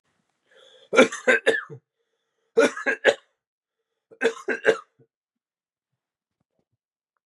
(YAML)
three_cough_length: 7.3 s
three_cough_amplitude: 27773
three_cough_signal_mean_std_ratio: 0.29
survey_phase: beta (2021-08-13 to 2022-03-07)
age: 18-44
gender: Male
wearing_mask: 'No'
symptom_cough_any: true
symptom_new_continuous_cough: true
symptom_runny_or_blocked_nose: true
symptom_sore_throat: true
symptom_fatigue: true
symptom_fever_high_temperature: true
symptom_headache: true
symptom_change_to_sense_of_smell_or_taste: true
symptom_onset: 3 days
smoker_status: Never smoked
respiratory_condition_asthma: false
respiratory_condition_other: false
recruitment_source: Test and Trace
submission_delay: 2 days
covid_test_result: Positive
covid_test_method: RT-qPCR
covid_ct_value: 20.6
covid_ct_gene: ORF1ab gene